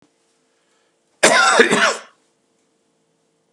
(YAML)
cough_length: 3.5 s
cough_amplitude: 32768
cough_signal_mean_std_ratio: 0.37
survey_phase: beta (2021-08-13 to 2022-03-07)
age: 45-64
gender: Male
wearing_mask: 'No'
symptom_cough_any: true
symptom_runny_or_blocked_nose: true
symptom_sore_throat: true
symptom_diarrhoea: true
symptom_fatigue: true
symptom_fever_high_temperature: true
symptom_other: true
smoker_status: Ex-smoker
respiratory_condition_asthma: false
respiratory_condition_other: false
recruitment_source: Test and Trace
submission_delay: -1 day
covid_test_result: Positive
covid_test_method: LFT